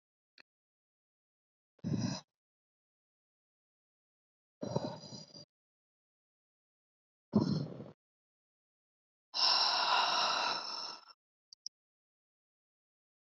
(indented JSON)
{
  "exhalation_length": "13.4 s",
  "exhalation_amplitude": 4668,
  "exhalation_signal_mean_std_ratio": 0.34,
  "survey_phase": "alpha (2021-03-01 to 2021-08-12)",
  "age": "18-44",
  "gender": "Female",
  "wearing_mask": "No",
  "symptom_none": true,
  "symptom_onset": "7 days",
  "smoker_status": "Never smoked",
  "respiratory_condition_asthma": false,
  "respiratory_condition_other": false,
  "recruitment_source": "REACT",
  "submission_delay": "1 day",
  "covid_test_result": "Negative",
  "covid_test_method": "RT-qPCR"
}